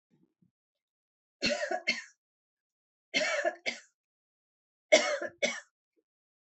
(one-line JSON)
{"three_cough_length": "6.6 s", "three_cough_amplitude": 14838, "three_cough_signal_mean_std_ratio": 0.33, "survey_phase": "alpha (2021-03-01 to 2021-08-12)", "age": "45-64", "gender": "Female", "wearing_mask": "No", "symptom_none": true, "smoker_status": "Never smoked", "respiratory_condition_asthma": false, "respiratory_condition_other": false, "recruitment_source": "REACT", "submission_delay": "1 day", "covid_test_result": "Negative", "covid_test_method": "RT-qPCR"}